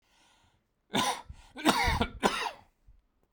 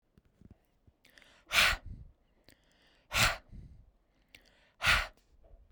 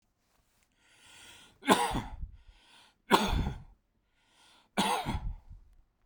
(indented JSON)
{
  "cough_length": "3.3 s",
  "cough_amplitude": 12805,
  "cough_signal_mean_std_ratio": 0.44,
  "exhalation_length": "5.7 s",
  "exhalation_amplitude": 9293,
  "exhalation_signal_mean_std_ratio": 0.31,
  "three_cough_length": "6.1 s",
  "three_cough_amplitude": 13917,
  "three_cough_signal_mean_std_ratio": 0.38,
  "survey_phase": "beta (2021-08-13 to 2022-03-07)",
  "age": "18-44",
  "gender": "Male",
  "wearing_mask": "No",
  "symptom_none": true,
  "smoker_status": "Never smoked",
  "respiratory_condition_asthma": false,
  "respiratory_condition_other": false,
  "recruitment_source": "Test and Trace",
  "submission_delay": "0 days",
  "covid_test_result": "Negative",
  "covid_test_method": "LFT"
}